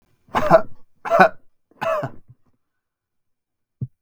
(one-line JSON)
{"three_cough_length": "4.0 s", "three_cough_amplitude": 32768, "three_cough_signal_mean_std_ratio": 0.35, "survey_phase": "beta (2021-08-13 to 2022-03-07)", "age": "18-44", "gender": "Male", "wearing_mask": "No", "symptom_none": true, "smoker_status": "Never smoked", "respiratory_condition_asthma": false, "respiratory_condition_other": false, "recruitment_source": "REACT", "submission_delay": "0 days", "covid_test_result": "Negative", "covid_test_method": "RT-qPCR", "influenza_a_test_result": "Negative", "influenza_b_test_result": "Negative"}